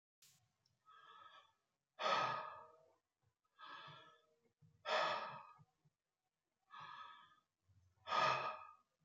{
  "exhalation_length": "9.0 s",
  "exhalation_amplitude": 2064,
  "exhalation_signal_mean_std_ratio": 0.37,
  "survey_phase": "beta (2021-08-13 to 2022-03-07)",
  "age": "45-64",
  "gender": "Male",
  "wearing_mask": "No",
  "symptom_runny_or_blocked_nose": true,
  "symptom_onset": "12 days",
  "smoker_status": "Never smoked",
  "respiratory_condition_asthma": false,
  "respiratory_condition_other": false,
  "recruitment_source": "REACT",
  "submission_delay": "0 days",
  "covid_test_result": "Negative",
  "covid_test_method": "RT-qPCR",
  "influenza_a_test_result": "Negative",
  "influenza_b_test_result": "Negative"
}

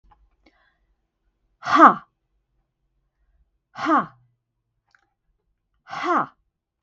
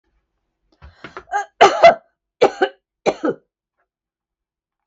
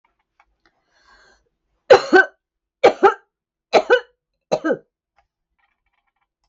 {
  "exhalation_length": "6.8 s",
  "exhalation_amplitude": 32588,
  "exhalation_signal_mean_std_ratio": 0.23,
  "cough_length": "4.9 s",
  "cough_amplitude": 32768,
  "cough_signal_mean_std_ratio": 0.28,
  "three_cough_length": "6.5 s",
  "three_cough_amplitude": 32768,
  "three_cough_signal_mean_std_ratio": 0.26,
  "survey_phase": "beta (2021-08-13 to 2022-03-07)",
  "age": "65+",
  "gender": "Female",
  "wearing_mask": "No",
  "symptom_abdominal_pain": true,
  "symptom_headache": true,
  "smoker_status": "Ex-smoker",
  "respiratory_condition_asthma": false,
  "respiratory_condition_other": false,
  "recruitment_source": "REACT",
  "submission_delay": "1 day",
  "covid_test_result": "Negative",
  "covid_test_method": "RT-qPCR",
  "influenza_a_test_result": "Negative",
  "influenza_b_test_result": "Negative"
}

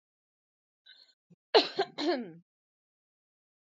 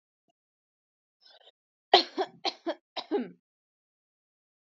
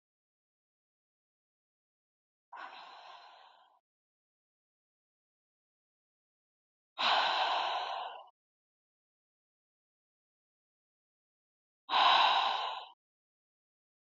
{
  "cough_length": "3.7 s",
  "cough_amplitude": 13072,
  "cough_signal_mean_std_ratio": 0.25,
  "three_cough_length": "4.6 s",
  "three_cough_amplitude": 18819,
  "three_cough_signal_mean_std_ratio": 0.22,
  "exhalation_length": "14.2 s",
  "exhalation_amplitude": 6568,
  "exhalation_signal_mean_std_ratio": 0.3,
  "survey_phase": "beta (2021-08-13 to 2022-03-07)",
  "age": "18-44",
  "gender": "Female",
  "wearing_mask": "No",
  "symptom_sore_throat": true,
  "smoker_status": "Never smoked",
  "respiratory_condition_asthma": false,
  "respiratory_condition_other": false,
  "recruitment_source": "Test and Trace",
  "submission_delay": "2 days",
  "covid_test_result": "Positive",
  "covid_test_method": "RT-qPCR"
}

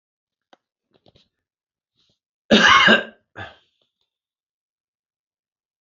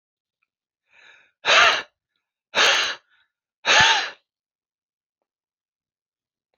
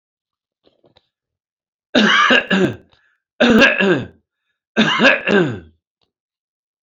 {
  "cough_length": "5.8 s",
  "cough_amplitude": 28304,
  "cough_signal_mean_std_ratio": 0.24,
  "exhalation_length": "6.6 s",
  "exhalation_amplitude": 26554,
  "exhalation_signal_mean_std_ratio": 0.33,
  "three_cough_length": "6.8 s",
  "three_cough_amplitude": 29204,
  "three_cough_signal_mean_std_ratio": 0.45,
  "survey_phase": "beta (2021-08-13 to 2022-03-07)",
  "age": "45-64",
  "gender": "Male",
  "wearing_mask": "No",
  "symptom_none": true,
  "smoker_status": "Ex-smoker",
  "respiratory_condition_asthma": false,
  "respiratory_condition_other": false,
  "recruitment_source": "REACT",
  "submission_delay": "2 days",
  "covid_test_result": "Negative",
  "covid_test_method": "RT-qPCR",
  "influenza_a_test_result": "Negative",
  "influenza_b_test_result": "Negative"
}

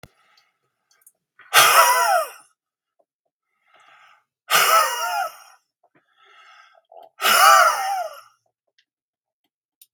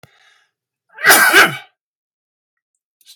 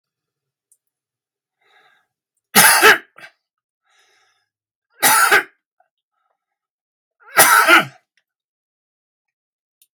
{
  "exhalation_length": "9.9 s",
  "exhalation_amplitude": 32768,
  "exhalation_signal_mean_std_ratio": 0.38,
  "cough_length": "3.2 s",
  "cough_amplitude": 32768,
  "cough_signal_mean_std_ratio": 0.33,
  "three_cough_length": "9.9 s",
  "three_cough_amplitude": 32768,
  "three_cough_signal_mean_std_ratio": 0.29,
  "survey_phase": "beta (2021-08-13 to 2022-03-07)",
  "age": "65+",
  "gender": "Male",
  "wearing_mask": "No",
  "symptom_none": true,
  "smoker_status": "Never smoked",
  "respiratory_condition_asthma": false,
  "respiratory_condition_other": false,
  "recruitment_source": "REACT",
  "submission_delay": "1 day",
  "covid_test_result": "Negative",
  "covid_test_method": "RT-qPCR"
}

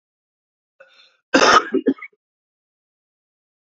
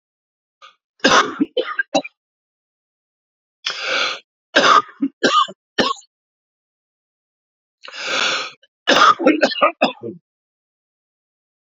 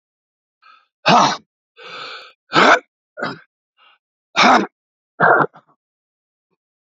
{
  "cough_length": "3.7 s",
  "cough_amplitude": 29111,
  "cough_signal_mean_std_ratio": 0.27,
  "three_cough_length": "11.7 s",
  "three_cough_amplitude": 31435,
  "three_cough_signal_mean_std_ratio": 0.38,
  "exhalation_length": "6.9 s",
  "exhalation_amplitude": 31893,
  "exhalation_signal_mean_std_ratio": 0.34,
  "survey_phase": "beta (2021-08-13 to 2022-03-07)",
  "age": "45-64",
  "gender": "Male",
  "wearing_mask": "No",
  "symptom_cough_any": true,
  "symptom_runny_or_blocked_nose": true,
  "symptom_sore_throat": true,
  "symptom_fatigue": true,
  "symptom_headache": true,
  "symptom_onset": "4 days",
  "smoker_status": "Never smoked",
  "respiratory_condition_asthma": false,
  "respiratory_condition_other": false,
  "recruitment_source": "Test and Trace",
  "submission_delay": "1 day",
  "covid_test_result": "Positive",
  "covid_test_method": "ePCR"
}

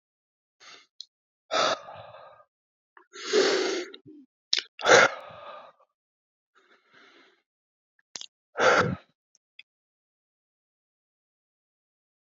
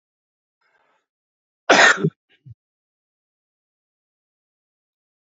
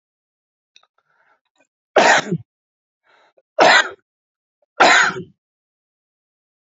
{
  "exhalation_length": "12.3 s",
  "exhalation_amplitude": 24834,
  "exhalation_signal_mean_std_ratio": 0.28,
  "cough_length": "5.2 s",
  "cough_amplitude": 29792,
  "cough_signal_mean_std_ratio": 0.2,
  "three_cough_length": "6.7 s",
  "three_cough_amplitude": 32768,
  "three_cough_signal_mean_std_ratio": 0.3,
  "survey_phase": "beta (2021-08-13 to 2022-03-07)",
  "age": "45-64",
  "gender": "Male",
  "wearing_mask": "No",
  "symptom_sore_throat": true,
  "smoker_status": "Current smoker (1 to 10 cigarettes per day)",
  "respiratory_condition_asthma": false,
  "respiratory_condition_other": false,
  "recruitment_source": "Test and Trace",
  "submission_delay": "1 day",
  "covid_test_result": "Positive",
  "covid_test_method": "LFT"
}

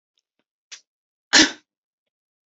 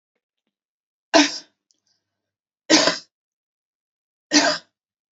{
  "cough_length": "2.5 s",
  "cough_amplitude": 32768,
  "cough_signal_mean_std_ratio": 0.2,
  "three_cough_length": "5.1 s",
  "three_cough_amplitude": 30996,
  "three_cough_signal_mean_std_ratio": 0.28,
  "survey_phase": "alpha (2021-03-01 to 2021-08-12)",
  "age": "45-64",
  "gender": "Female",
  "wearing_mask": "No",
  "symptom_cough_any": true,
  "symptom_new_continuous_cough": true,
  "symptom_fatigue": true,
  "symptom_onset": "4 days",
  "smoker_status": "Ex-smoker",
  "respiratory_condition_asthma": false,
  "respiratory_condition_other": false,
  "recruitment_source": "Test and Trace",
  "submission_delay": "1 day",
  "covid_test_result": "Positive",
  "covid_test_method": "RT-qPCR",
  "covid_ct_value": 18.8,
  "covid_ct_gene": "ORF1ab gene",
  "covid_ct_mean": 19.3,
  "covid_viral_load": "460000 copies/ml",
  "covid_viral_load_category": "Low viral load (10K-1M copies/ml)"
}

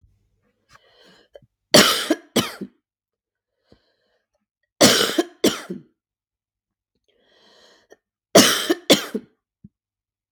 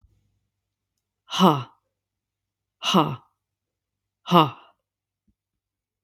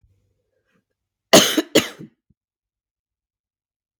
{
  "three_cough_length": "10.3 s",
  "three_cough_amplitude": 32768,
  "three_cough_signal_mean_std_ratio": 0.28,
  "exhalation_length": "6.0 s",
  "exhalation_amplitude": 32767,
  "exhalation_signal_mean_std_ratio": 0.25,
  "cough_length": "4.0 s",
  "cough_amplitude": 32768,
  "cough_signal_mean_std_ratio": 0.22,
  "survey_phase": "beta (2021-08-13 to 2022-03-07)",
  "age": "18-44",
  "gender": "Female",
  "wearing_mask": "No",
  "symptom_cough_any": true,
  "symptom_runny_or_blocked_nose": true,
  "symptom_fatigue": true,
  "symptom_headache": true,
  "smoker_status": "Ex-smoker",
  "respiratory_condition_asthma": false,
  "respiratory_condition_other": false,
  "recruitment_source": "Test and Trace",
  "submission_delay": "1 day",
  "covid_test_result": "Positive",
  "covid_test_method": "RT-qPCR"
}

